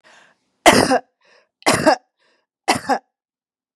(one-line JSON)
{"three_cough_length": "3.8 s", "three_cough_amplitude": 32768, "three_cough_signal_mean_std_ratio": 0.35, "survey_phase": "beta (2021-08-13 to 2022-03-07)", "age": "45-64", "gender": "Female", "wearing_mask": "No", "symptom_none": true, "smoker_status": "Never smoked", "respiratory_condition_asthma": false, "respiratory_condition_other": false, "recruitment_source": "REACT", "submission_delay": "1 day", "covid_test_result": "Negative", "covid_test_method": "RT-qPCR", "influenza_a_test_result": "Negative", "influenza_b_test_result": "Negative"}